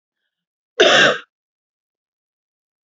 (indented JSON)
{
  "cough_length": "2.9 s",
  "cough_amplitude": 32767,
  "cough_signal_mean_std_ratio": 0.29,
  "survey_phase": "beta (2021-08-13 to 2022-03-07)",
  "age": "18-44",
  "gender": "Female",
  "wearing_mask": "No",
  "symptom_cough_any": true,
  "symptom_new_continuous_cough": true,
  "symptom_runny_or_blocked_nose": true,
  "symptom_shortness_of_breath": true,
  "symptom_sore_throat": true,
  "symptom_abdominal_pain": true,
  "symptom_fatigue": true,
  "symptom_fever_high_temperature": true,
  "symptom_onset": "5 days",
  "smoker_status": "Never smoked",
  "respiratory_condition_asthma": true,
  "respiratory_condition_other": false,
  "recruitment_source": "Test and Trace",
  "submission_delay": "2 days",
  "covid_test_result": "Positive",
  "covid_test_method": "RT-qPCR",
  "covid_ct_value": 14.7,
  "covid_ct_gene": "ORF1ab gene",
  "covid_ct_mean": 15.7,
  "covid_viral_load": "6900000 copies/ml",
  "covid_viral_load_category": "High viral load (>1M copies/ml)"
}